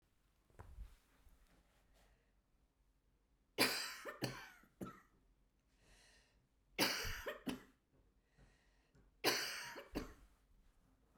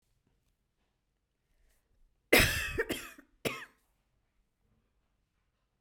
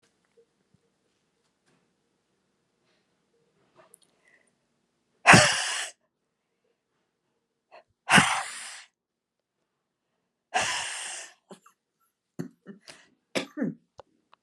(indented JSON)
{
  "three_cough_length": "11.2 s",
  "three_cough_amplitude": 4219,
  "three_cough_signal_mean_std_ratio": 0.35,
  "cough_length": "5.8 s",
  "cough_amplitude": 12865,
  "cough_signal_mean_std_ratio": 0.24,
  "exhalation_length": "14.4 s",
  "exhalation_amplitude": 23494,
  "exhalation_signal_mean_std_ratio": 0.22,
  "survey_phase": "beta (2021-08-13 to 2022-03-07)",
  "age": "45-64",
  "gender": "Female",
  "wearing_mask": "No",
  "symptom_none": true,
  "smoker_status": "Never smoked",
  "respiratory_condition_asthma": false,
  "respiratory_condition_other": false,
  "recruitment_source": "REACT",
  "submission_delay": "10 days",
  "covid_test_result": "Negative",
  "covid_test_method": "RT-qPCR"
}